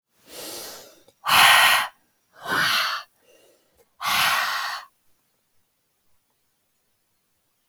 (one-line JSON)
{"exhalation_length": "7.7 s", "exhalation_amplitude": 26868, "exhalation_signal_mean_std_ratio": 0.39, "survey_phase": "alpha (2021-03-01 to 2021-08-12)", "age": "18-44", "gender": "Female", "wearing_mask": "No", "symptom_none": true, "symptom_onset": "6 days", "smoker_status": "Never smoked", "respiratory_condition_asthma": false, "respiratory_condition_other": false, "recruitment_source": "REACT", "submission_delay": "2 days", "covid_test_result": "Negative", "covid_test_method": "RT-qPCR"}